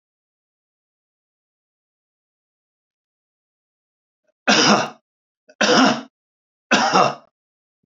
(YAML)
three_cough_length: 7.9 s
three_cough_amplitude: 28714
three_cough_signal_mean_std_ratio: 0.31
survey_phase: beta (2021-08-13 to 2022-03-07)
age: 65+
gender: Male
wearing_mask: 'No'
symptom_none: true
smoker_status: Ex-smoker
respiratory_condition_asthma: false
respiratory_condition_other: false
recruitment_source: REACT
submission_delay: 2 days
covid_test_result: Negative
covid_test_method: RT-qPCR
influenza_a_test_result: Negative
influenza_b_test_result: Negative